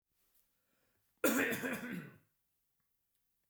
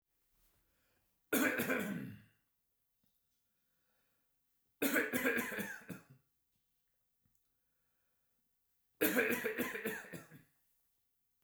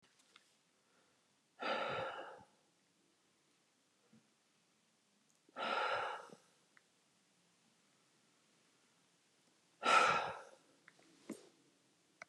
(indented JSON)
{
  "cough_length": "3.5 s",
  "cough_amplitude": 3815,
  "cough_signal_mean_std_ratio": 0.35,
  "three_cough_length": "11.4 s",
  "three_cough_amplitude": 4620,
  "three_cough_signal_mean_std_ratio": 0.39,
  "exhalation_length": "12.3 s",
  "exhalation_amplitude": 4356,
  "exhalation_signal_mean_std_ratio": 0.3,
  "survey_phase": "beta (2021-08-13 to 2022-03-07)",
  "age": "45-64",
  "gender": "Male",
  "wearing_mask": "No",
  "symptom_none": true,
  "smoker_status": "Ex-smoker",
  "respiratory_condition_asthma": false,
  "respiratory_condition_other": false,
  "recruitment_source": "REACT",
  "submission_delay": "1 day",
  "covid_test_result": "Negative",
  "covid_test_method": "RT-qPCR",
  "influenza_a_test_result": "Negative",
  "influenza_b_test_result": "Negative"
}